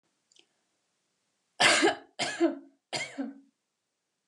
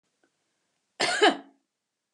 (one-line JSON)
{"three_cough_length": "4.3 s", "three_cough_amplitude": 13970, "three_cough_signal_mean_std_ratio": 0.35, "cough_length": "2.1 s", "cough_amplitude": 15341, "cough_signal_mean_std_ratio": 0.3, "survey_phase": "alpha (2021-03-01 to 2021-08-12)", "age": "65+", "gender": "Female", "wearing_mask": "No", "symptom_none": true, "smoker_status": "Never smoked", "respiratory_condition_asthma": false, "respiratory_condition_other": false, "recruitment_source": "REACT", "submission_delay": "1 day", "covid_test_result": "Negative", "covid_test_method": "RT-qPCR"}